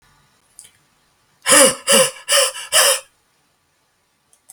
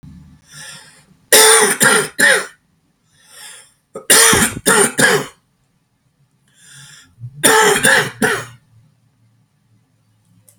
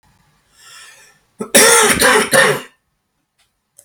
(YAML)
exhalation_length: 4.5 s
exhalation_amplitude: 32768
exhalation_signal_mean_std_ratio: 0.38
three_cough_length: 10.6 s
three_cough_amplitude: 32768
three_cough_signal_mean_std_ratio: 0.44
cough_length: 3.8 s
cough_amplitude: 32768
cough_signal_mean_std_ratio: 0.44
survey_phase: beta (2021-08-13 to 2022-03-07)
age: 18-44
gender: Male
wearing_mask: 'No'
symptom_cough_any: true
symptom_runny_or_blocked_nose: true
symptom_sore_throat: true
symptom_onset: 6 days
smoker_status: Never smoked
respiratory_condition_asthma: false
respiratory_condition_other: false
recruitment_source: REACT
submission_delay: 4 days
covid_test_result: Negative
covid_test_method: RT-qPCR
covid_ct_value: 41.0
covid_ct_gene: N gene